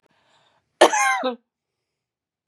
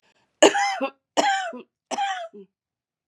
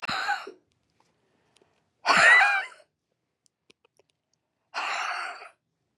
{"cough_length": "2.5 s", "cough_amplitude": 32768, "cough_signal_mean_std_ratio": 0.31, "three_cough_length": "3.1 s", "three_cough_amplitude": 30040, "three_cough_signal_mean_std_ratio": 0.43, "exhalation_length": "6.0 s", "exhalation_amplitude": 17198, "exhalation_signal_mean_std_ratio": 0.35, "survey_phase": "beta (2021-08-13 to 2022-03-07)", "age": "65+", "gender": "Female", "wearing_mask": "No", "symptom_cough_any": true, "symptom_runny_or_blocked_nose": true, "symptom_abdominal_pain": true, "symptom_headache": true, "smoker_status": "Ex-smoker", "respiratory_condition_asthma": false, "respiratory_condition_other": true, "recruitment_source": "Test and Trace", "submission_delay": "2 days", "covid_test_result": "Positive", "covid_test_method": "LFT"}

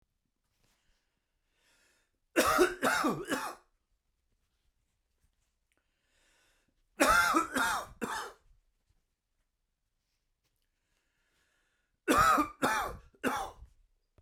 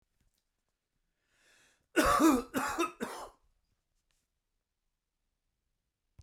{"three_cough_length": "14.2 s", "three_cough_amplitude": 9327, "three_cough_signal_mean_std_ratio": 0.35, "cough_length": "6.2 s", "cough_amplitude": 8085, "cough_signal_mean_std_ratio": 0.29, "survey_phase": "beta (2021-08-13 to 2022-03-07)", "age": "45-64", "gender": "Male", "wearing_mask": "No", "symptom_none": true, "smoker_status": "Never smoked", "respiratory_condition_asthma": false, "respiratory_condition_other": false, "recruitment_source": "REACT", "submission_delay": "2 days", "covid_test_result": "Negative", "covid_test_method": "RT-qPCR", "influenza_a_test_result": "Negative", "influenza_b_test_result": "Negative"}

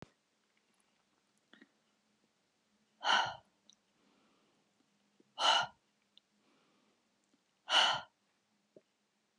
{"exhalation_length": "9.4 s", "exhalation_amplitude": 6101, "exhalation_signal_mean_std_ratio": 0.24, "survey_phase": "alpha (2021-03-01 to 2021-08-12)", "age": "65+", "gender": "Female", "wearing_mask": "No", "symptom_none": true, "smoker_status": "Never smoked", "respiratory_condition_asthma": false, "respiratory_condition_other": false, "recruitment_source": "REACT", "submission_delay": "2 days", "covid_test_result": "Negative", "covid_test_method": "RT-qPCR"}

